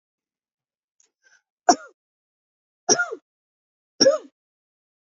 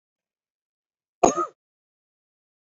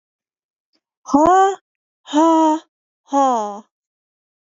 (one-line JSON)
{"three_cough_length": "5.1 s", "three_cough_amplitude": 27288, "three_cough_signal_mean_std_ratio": 0.21, "cough_length": "2.6 s", "cough_amplitude": 27786, "cough_signal_mean_std_ratio": 0.18, "exhalation_length": "4.4 s", "exhalation_amplitude": 27412, "exhalation_signal_mean_std_ratio": 0.47, "survey_phase": "beta (2021-08-13 to 2022-03-07)", "age": "45-64", "gender": "Female", "wearing_mask": "No", "symptom_none": true, "smoker_status": "Ex-smoker", "respiratory_condition_asthma": false, "respiratory_condition_other": false, "recruitment_source": "REACT", "submission_delay": "1 day", "covid_test_result": "Negative", "covid_test_method": "RT-qPCR", "influenza_a_test_result": "Negative", "influenza_b_test_result": "Negative"}